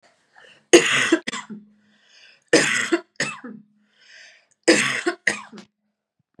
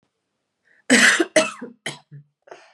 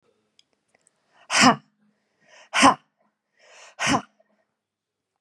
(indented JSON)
{
  "three_cough_length": "6.4 s",
  "three_cough_amplitude": 32767,
  "three_cough_signal_mean_std_ratio": 0.36,
  "cough_length": "2.7 s",
  "cough_amplitude": 30919,
  "cough_signal_mean_std_ratio": 0.36,
  "exhalation_length": "5.2 s",
  "exhalation_amplitude": 28304,
  "exhalation_signal_mean_std_ratio": 0.26,
  "survey_phase": "beta (2021-08-13 to 2022-03-07)",
  "age": "18-44",
  "gender": "Female",
  "wearing_mask": "No",
  "symptom_runny_or_blocked_nose": true,
  "symptom_headache": true,
  "symptom_onset": "8 days",
  "smoker_status": "Never smoked",
  "respiratory_condition_asthma": false,
  "respiratory_condition_other": false,
  "recruitment_source": "REACT",
  "submission_delay": "2 days",
  "covid_test_result": "Negative",
  "covid_test_method": "RT-qPCR"
}